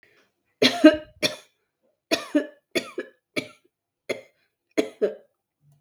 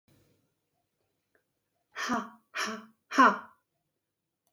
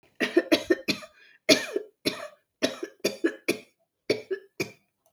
{"three_cough_length": "5.8 s", "three_cough_amplitude": 32768, "three_cough_signal_mean_std_ratio": 0.27, "exhalation_length": "4.5 s", "exhalation_amplitude": 11634, "exhalation_signal_mean_std_ratio": 0.26, "cough_length": "5.1 s", "cough_amplitude": 26857, "cough_signal_mean_std_ratio": 0.37, "survey_phase": "beta (2021-08-13 to 2022-03-07)", "age": "45-64", "gender": "Female", "wearing_mask": "No", "symptom_change_to_sense_of_smell_or_taste": true, "smoker_status": "Never smoked", "respiratory_condition_asthma": false, "respiratory_condition_other": false, "recruitment_source": "REACT", "submission_delay": "2 days", "covid_test_result": "Negative", "covid_test_method": "RT-qPCR", "influenza_a_test_result": "Negative", "influenza_b_test_result": "Negative"}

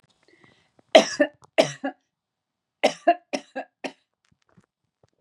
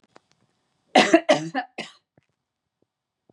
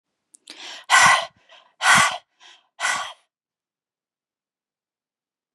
{"three_cough_length": "5.2 s", "three_cough_amplitude": 32588, "three_cough_signal_mean_std_ratio": 0.24, "cough_length": "3.3 s", "cough_amplitude": 27629, "cough_signal_mean_std_ratio": 0.27, "exhalation_length": "5.5 s", "exhalation_amplitude": 27720, "exhalation_signal_mean_std_ratio": 0.31, "survey_phase": "beta (2021-08-13 to 2022-03-07)", "age": "45-64", "gender": "Female", "wearing_mask": "No", "symptom_none": true, "smoker_status": "Never smoked", "respiratory_condition_asthma": false, "respiratory_condition_other": false, "recruitment_source": "REACT", "submission_delay": "1 day", "covid_test_result": "Negative", "covid_test_method": "RT-qPCR", "influenza_a_test_result": "Negative", "influenza_b_test_result": "Negative"}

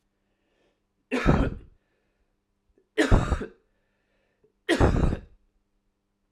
{"three_cough_length": "6.3 s", "three_cough_amplitude": 16860, "three_cough_signal_mean_std_ratio": 0.35, "survey_phase": "beta (2021-08-13 to 2022-03-07)", "age": "18-44", "gender": "Male", "wearing_mask": "No", "symptom_cough_any": true, "symptom_runny_or_blocked_nose": true, "symptom_change_to_sense_of_smell_or_taste": true, "symptom_onset": "9 days", "smoker_status": "Never smoked", "respiratory_condition_asthma": false, "respiratory_condition_other": false, "recruitment_source": "Test and Trace", "submission_delay": "6 days", "covid_test_result": "Positive", "covid_test_method": "RT-qPCR"}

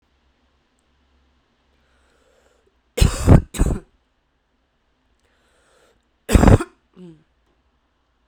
{"cough_length": "8.3 s", "cough_amplitude": 32768, "cough_signal_mean_std_ratio": 0.23, "survey_phase": "beta (2021-08-13 to 2022-03-07)", "age": "18-44", "gender": "Female", "wearing_mask": "No", "symptom_runny_or_blocked_nose": true, "symptom_fatigue": true, "symptom_headache": true, "symptom_change_to_sense_of_smell_or_taste": true, "symptom_loss_of_taste": true, "smoker_status": "Current smoker (11 or more cigarettes per day)", "respiratory_condition_asthma": false, "respiratory_condition_other": false, "recruitment_source": "Test and Trace", "submission_delay": "3 days", "covid_test_result": "Positive", "covid_test_method": "RT-qPCR", "covid_ct_value": 28.9, "covid_ct_gene": "ORF1ab gene"}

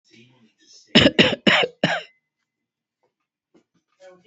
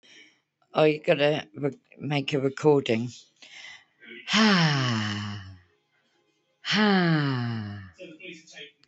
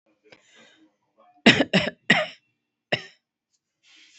{"cough_length": "4.3 s", "cough_amplitude": 29460, "cough_signal_mean_std_ratio": 0.3, "exhalation_length": "8.9 s", "exhalation_amplitude": 14193, "exhalation_signal_mean_std_ratio": 0.54, "three_cough_length": "4.2 s", "three_cough_amplitude": 28883, "three_cough_signal_mean_std_ratio": 0.26, "survey_phase": "beta (2021-08-13 to 2022-03-07)", "age": "18-44", "gender": "Female", "wearing_mask": "No", "symptom_abdominal_pain": true, "symptom_diarrhoea": true, "symptom_fatigue": true, "symptom_onset": "12 days", "smoker_status": "Current smoker (11 or more cigarettes per day)", "respiratory_condition_asthma": true, "respiratory_condition_other": false, "recruitment_source": "REACT", "submission_delay": "10 days", "covid_test_result": "Negative", "covid_test_method": "RT-qPCR"}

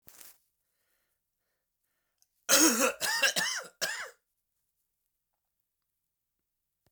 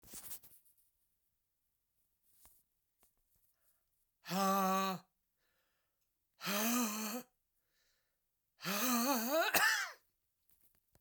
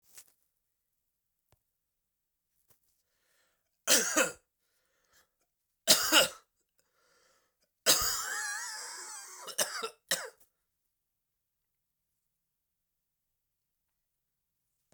{"cough_length": "6.9 s", "cough_amplitude": 12905, "cough_signal_mean_std_ratio": 0.31, "exhalation_length": "11.0 s", "exhalation_amplitude": 4888, "exhalation_signal_mean_std_ratio": 0.42, "three_cough_length": "14.9 s", "three_cough_amplitude": 15498, "three_cough_signal_mean_std_ratio": 0.26, "survey_phase": "beta (2021-08-13 to 2022-03-07)", "age": "45-64", "gender": "Male", "wearing_mask": "No", "symptom_cough_any": true, "symptom_runny_or_blocked_nose": true, "symptom_shortness_of_breath": true, "symptom_sore_throat": true, "symptom_fatigue": true, "symptom_headache": true, "symptom_change_to_sense_of_smell_or_taste": true, "symptom_loss_of_taste": true, "smoker_status": "Ex-smoker", "respiratory_condition_asthma": false, "respiratory_condition_other": false, "recruitment_source": "Test and Trace", "submission_delay": "2 days", "covid_test_result": "Positive", "covid_test_method": "ePCR"}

